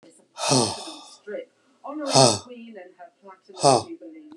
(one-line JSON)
{"exhalation_length": "4.4 s", "exhalation_amplitude": 31400, "exhalation_signal_mean_std_ratio": 0.4, "survey_phase": "beta (2021-08-13 to 2022-03-07)", "age": "45-64", "gender": "Male", "wearing_mask": "No", "symptom_none": true, "smoker_status": "Never smoked", "respiratory_condition_asthma": false, "respiratory_condition_other": false, "recruitment_source": "REACT", "submission_delay": "2 days", "covid_test_result": "Negative", "covid_test_method": "RT-qPCR"}